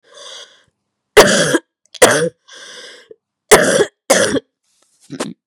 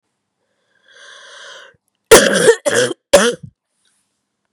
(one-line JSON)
{"three_cough_length": "5.5 s", "three_cough_amplitude": 32768, "three_cough_signal_mean_std_ratio": 0.4, "cough_length": "4.5 s", "cough_amplitude": 32768, "cough_signal_mean_std_ratio": 0.34, "survey_phase": "beta (2021-08-13 to 2022-03-07)", "age": "18-44", "gender": "Female", "wearing_mask": "No", "symptom_cough_any": true, "symptom_new_continuous_cough": true, "symptom_runny_or_blocked_nose": true, "symptom_sore_throat": true, "symptom_diarrhoea": true, "symptom_fatigue": true, "symptom_headache": true, "symptom_onset": "3 days", "smoker_status": "Never smoked", "respiratory_condition_asthma": false, "respiratory_condition_other": false, "recruitment_source": "Test and Trace", "submission_delay": "1 day", "covid_test_result": "Positive", "covid_test_method": "RT-qPCR", "covid_ct_value": 15.9, "covid_ct_gene": "ORF1ab gene", "covid_ct_mean": 16.4, "covid_viral_load": "4100000 copies/ml", "covid_viral_load_category": "High viral load (>1M copies/ml)"}